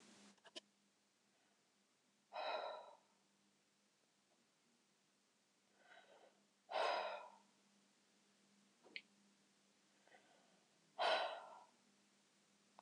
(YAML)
exhalation_length: 12.8 s
exhalation_amplitude: 1535
exhalation_signal_mean_std_ratio: 0.31
survey_phase: beta (2021-08-13 to 2022-03-07)
age: 65+
gender: Female
wearing_mask: 'No'
symptom_none: true
smoker_status: Never smoked
respiratory_condition_asthma: false
respiratory_condition_other: false
recruitment_source: REACT
submission_delay: 0 days
covid_test_result: Negative
covid_test_method: RT-qPCR
influenza_a_test_result: Negative
influenza_b_test_result: Negative